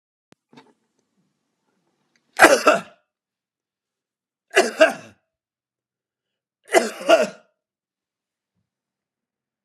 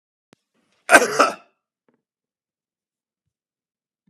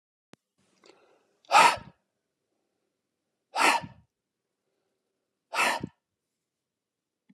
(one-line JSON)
{"three_cough_length": "9.6 s", "three_cough_amplitude": 32768, "three_cough_signal_mean_std_ratio": 0.23, "cough_length": "4.1 s", "cough_amplitude": 32768, "cough_signal_mean_std_ratio": 0.2, "exhalation_length": "7.3 s", "exhalation_amplitude": 16704, "exhalation_signal_mean_std_ratio": 0.24, "survey_phase": "beta (2021-08-13 to 2022-03-07)", "age": "65+", "gender": "Male", "wearing_mask": "No", "symptom_cough_any": true, "symptom_runny_or_blocked_nose": true, "symptom_sore_throat": true, "symptom_fatigue": true, "symptom_fever_high_temperature": true, "smoker_status": "Never smoked", "respiratory_condition_asthma": false, "respiratory_condition_other": false, "recruitment_source": "Test and Trace", "submission_delay": "2 days", "covid_test_result": "Positive", "covid_test_method": "RT-qPCR", "covid_ct_value": 16.8, "covid_ct_gene": "ORF1ab gene", "covid_ct_mean": 17.4, "covid_viral_load": "1900000 copies/ml", "covid_viral_load_category": "High viral load (>1M copies/ml)"}